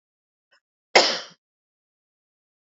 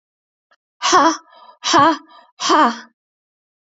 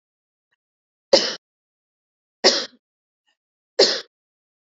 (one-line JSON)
{"cough_length": "2.6 s", "cough_amplitude": 32767, "cough_signal_mean_std_ratio": 0.2, "exhalation_length": "3.7 s", "exhalation_amplitude": 29664, "exhalation_signal_mean_std_ratio": 0.42, "three_cough_length": "4.7 s", "three_cough_amplitude": 32767, "three_cough_signal_mean_std_ratio": 0.24, "survey_phase": "beta (2021-08-13 to 2022-03-07)", "age": "45-64", "gender": "Female", "wearing_mask": "No", "symptom_cough_any": true, "symptom_runny_or_blocked_nose": true, "symptom_sore_throat": true, "smoker_status": "Never smoked", "respiratory_condition_asthma": false, "respiratory_condition_other": false, "recruitment_source": "Test and Trace", "submission_delay": "3 days", "covid_test_method": "RT-qPCR", "covid_ct_value": 37.1, "covid_ct_gene": "N gene"}